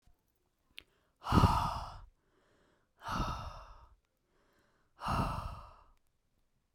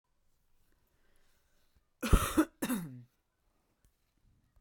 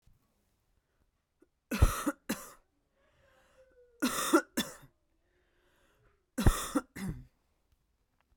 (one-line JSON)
{"exhalation_length": "6.7 s", "exhalation_amplitude": 8436, "exhalation_signal_mean_std_ratio": 0.35, "cough_length": "4.6 s", "cough_amplitude": 10096, "cough_signal_mean_std_ratio": 0.25, "three_cough_length": "8.4 s", "three_cough_amplitude": 9726, "three_cough_signal_mean_std_ratio": 0.28, "survey_phase": "beta (2021-08-13 to 2022-03-07)", "age": "18-44", "gender": "Female", "wearing_mask": "Yes", "symptom_cough_any": true, "symptom_runny_or_blocked_nose": true, "symptom_fatigue": true, "smoker_status": "Ex-smoker", "respiratory_condition_asthma": false, "respiratory_condition_other": false, "recruitment_source": "Test and Trace", "submission_delay": "1 day", "covid_test_result": "Positive", "covid_test_method": "RT-qPCR"}